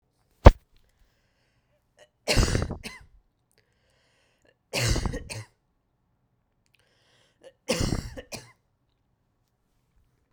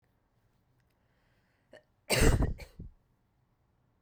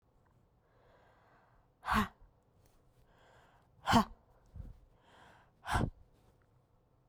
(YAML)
three_cough_length: 10.3 s
three_cough_amplitude: 32768
three_cough_signal_mean_std_ratio: 0.2
cough_length: 4.0 s
cough_amplitude: 9356
cough_signal_mean_std_ratio: 0.27
exhalation_length: 7.1 s
exhalation_amplitude: 6240
exhalation_signal_mean_std_ratio: 0.26
survey_phase: beta (2021-08-13 to 2022-03-07)
age: 18-44
gender: Female
wearing_mask: 'No'
symptom_cough_any: true
symptom_runny_or_blocked_nose: true
symptom_sore_throat: true
symptom_headache: true
symptom_change_to_sense_of_smell_or_taste: true
symptom_other: true
symptom_onset: 4 days
smoker_status: Ex-smoker
respiratory_condition_asthma: false
respiratory_condition_other: false
recruitment_source: REACT
submission_delay: 2 days
covid_test_result: Negative
covid_test_method: RT-qPCR